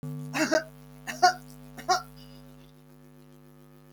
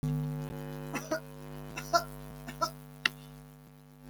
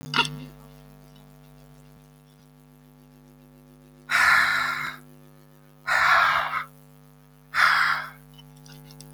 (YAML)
cough_length: 3.9 s
cough_amplitude: 14895
cough_signal_mean_std_ratio: 0.38
three_cough_length: 4.1 s
three_cough_amplitude: 14833
three_cough_signal_mean_std_ratio: 0.57
exhalation_length: 9.1 s
exhalation_amplitude: 16496
exhalation_signal_mean_std_ratio: 0.45
survey_phase: alpha (2021-03-01 to 2021-08-12)
age: 65+
gender: Female
wearing_mask: 'No'
symptom_none: true
smoker_status: Never smoked
respiratory_condition_asthma: false
respiratory_condition_other: false
recruitment_source: REACT
submission_delay: 2 days
covid_test_result: Negative
covid_test_method: RT-qPCR